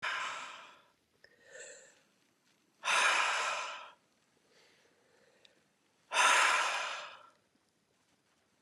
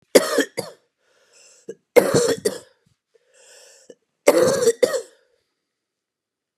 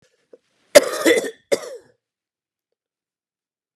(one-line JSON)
{"exhalation_length": "8.6 s", "exhalation_amplitude": 6418, "exhalation_signal_mean_std_ratio": 0.41, "three_cough_length": "6.6 s", "three_cough_amplitude": 32768, "three_cough_signal_mean_std_ratio": 0.34, "cough_length": "3.8 s", "cough_amplitude": 32768, "cough_signal_mean_std_ratio": 0.24, "survey_phase": "beta (2021-08-13 to 2022-03-07)", "age": "45-64", "gender": "Male", "wearing_mask": "No", "symptom_cough_any": true, "symptom_new_continuous_cough": true, "symptom_runny_or_blocked_nose": true, "symptom_sore_throat": true, "symptom_fatigue": true, "symptom_headache": true, "symptom_onset": "2 days", "smoker_status": "Never smoked", "respiratory_condition_asthma": false, "respiratory_condition_other": false, "recruitment_source": "Test and Trace", "submission_delay": "1 day", "covid_test_result": "Positive", "covid_test_method": "RT-qPCR", "covid_ct_value": 23.7, "covid_ct_gene": "N gene"}